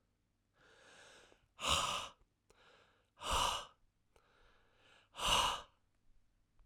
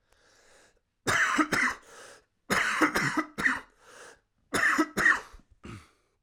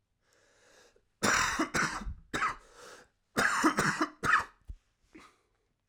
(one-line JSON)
{"exhalation_length": "6.7 s", "exhalation_amplitude": 3905, "exhalation_signal_mean_std_ratio": 0.37, "three_cough_length": "6.2 s", "three_cough_amplitude": 11059, "three_cough_signal_mean_std_ratio": 0.5, "cough_length": "5.9 s", "cough_amplitude": 9519, "cough_signal_mean_std_ratio": 0.48, "survey_phase": "alpha (2021-03-01 to 2021-08-12)", "age": "18-44", "gender": "Male", "wearing_mask": "No", "symptom_cough_any": true, "symptom_new_continuous_cough": true, "symptom_shortness_of_breath": true, "symptom_fatigue": true, "symptom_headache": true, "symptom_change_to_sense_of_smell_or_taste": true, "symptom_loss_of_taste": true, "symptom_onset": "3 days", "smoker_status": "Never smoked", "respiratory_condition_asthma": true, "respiratory_condition_other": false, "recruitment_source": "Test and Trace", "submission_delay": "2 days", "covid_test_result": "Positive", "covid_test_method": "RT-qPCR"}